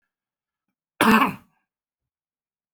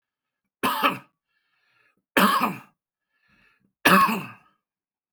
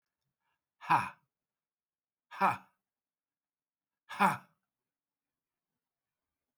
{
  "cough_length": "2.7 s",
  "cough_amplitude": 21161,
  "cough_signal_mean_std_ratio": 0.27,
  "three_cough_length": "5.1 s",
  "three_cough_amplitude": 25900,
  "three_cough_signal_mean_std_ratio": 0.35,
  "exhalation_length": "6.6 s",
  "exhalation_amplitude": 7138,
  "exhalation_signal_mean_std_ratio": 0.22,
  "survey_phase": "beta (2021-08-13 to 2022-03-07)",
  "age": "45-64",
  "gender": "Male",
  "wearing_mask": "No",
  "symptom_cough_any": true,
  "symptom_runny_or_blocked_nose": true,
  "symptom_sore_throat": true,
  "symptom_fatigue": true,
  "symptom_headache": true,
  "smoker_status": "Ex-smoker",
  "respiratory_condition_asthma": false,
  "respiratory_condition_other": false,
  "recruitment_source": "REACT",
  "submission_delay": "2 days",
  "covid_test_result": "Negative",
  "covid_test_method": "RT-qPCR"
}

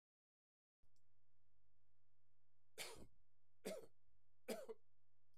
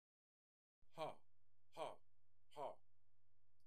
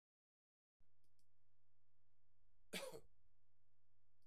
{
  "three_cough_length": "5.4 s",
  "three_cough_amplitude": 595,
  "three_cough_signal_mean_std_ratio": 1.35,
  "exhalation_length": "3.7 s",
  "exhalation_amplitude": 633,
  "exhalation_signal_mean_std_ratio": 1.02,
  "cough_length": "4.3 s",
  "cough_amplitude": 598,
  "cough_signal_mean_std_ratio": 1.46,
  "survey_phase": "beta (2021-08-13 to 2022-03-07)",
  "age": "45-64",
  "gender": "Male",
  "wearing_mask": "No",
  "symptom_none": true,
  "smoker_status": "Ex-smoker",
  "respiratory_condition_asthma": false,
  "respiratory_condition_other": false,
  "recruitment_source": "REACT",
  "submission_delay": "4 days",
  "covid_test_result": "Negative",
  "covid_test_method": "RT-qPCR",
  "influenza_a_test_result": "Negative",
  "influenza_b_test_result": "Negative"
}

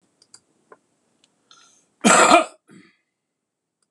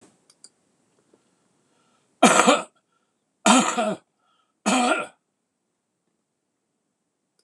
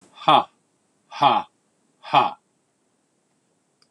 {
  "cough_length": "3.9 s",
  "cough_amplitude": 26028,
  "cough_signal_mean_std_ratio": 0.26,
  "three_cough_length": "7.4 s",
  "three_cough_amplitude": 26027,
  "three_cough_signal_mean_std_ratio": 0.3,
  "exhalation_length": "3.9 s",
  "exhalation_amplitude": 25543,
  "exhalation_signal_mean_std_ratio": 0.3,
  "survey_phase": "beta (2021-08-13 to 2022-03-07)",
  "age": "65+",
  "gender": "Male",
  "wearing_mask": "No",
  "symptom_none": true,
  "smoker_status": "Never smoked",
  "respiratory_condition_asthma": false,
  "respiratory_condition_other": false,
  "recruitment_source": "REACT",
  "submission_delay": "2 days",
  "covid_test_result": "Negative",
  "covid_test_method": "RT-qPCR"
}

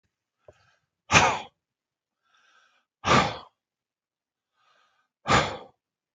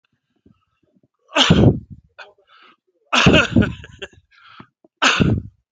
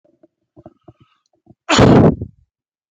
{
  "exhalation_length": "6.1 s",
  "exhalation_amplitude": 23884,
  "exhalation_signal_mean_std_ratio": 0.27,
  "three_cough_length": "5.7 s",
  "three_cough_amplitude": 29685,
  "three_cough_signal_mean_std_ratio": 0.39,
  "cough_length": "2.9 s",
  "cough_amplitude": 31422,
  "cough_signal_mean_std_ratio": 0.34,
  "survey_phase": "beta (2021-08-13 to 2022-03-07)",
  "age": "45-64",
  "gender": "Male",
  "wearing_mask": "No",
  "symptom_none": true,
  "smoker_status": "Never smoked",
  "respiratory_condition_asthma": false,
  "respiratory_condition_other": false,
  "recruitment_source": "REACT",
  "submission_delay": "1 day",
  "covid_test_result": "Negative",
  "covid_test_method": "RT-qPCR"
}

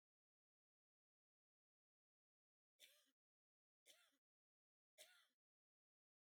{
  "three_cough_length": "6.3 s",
  "three_cough_amplitude": 99,
  "three_cough_signal_mean_std_ratio": 0.23,
  "survey_phase": "beta (2021-08-13 to 2022-03-07)",
  "age": "45-64",
  "gender": "Female",
  "wearing_mask": "No",
  "symptom_none": true,
  "smoker_status": "Never smoked",
  "respiratory_condition_asthma": false,
  "respiratory_condition_other": false,
  "recruitment_source": "REACT",
  "submission_delay": "1 day",
  "covid_test_result": "Negative",
  "covid_test_method": "RT-qPCR"
}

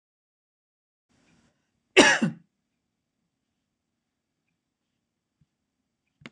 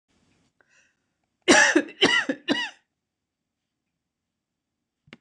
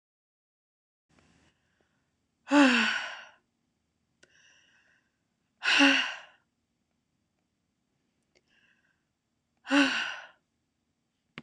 {
  "cough_length": "6.3 s",
  "cough_amplitude": 26028,
  "cough_signal_mean_std_ratio": 0.16,
  "three_cough_length": "5.2 s",
  "three_cough_amplitude": 24011,
  "three_cough_signal_mean_std_ratio": 0.3,
  "exhalation_length": "11.4 s",
  "exhalation_amplitude": 14767,
  "exhalation_signal_mean_std_ratio": 0.28,
  "survey_phase": "beta (2021-08-13 to 2022-03-07)",
  "age": "45-64",
  "gender": "Female",
  "wearing_mask": "No",
  "symptom_none": true,
  "smoker_status": "Never smoked",
  "respiratory_condition_asthma": false,
  "respiratory_condition_other": false,
  "recruitment_source": "REACT",
  "submission_delay": "3 days",
  "covid_test_result": "Negative",
  "covid_test_method": "RT-qPCR",
  "influenza_a_test_result": "Negative",
  "influenza_b_test_result": "Negative"
}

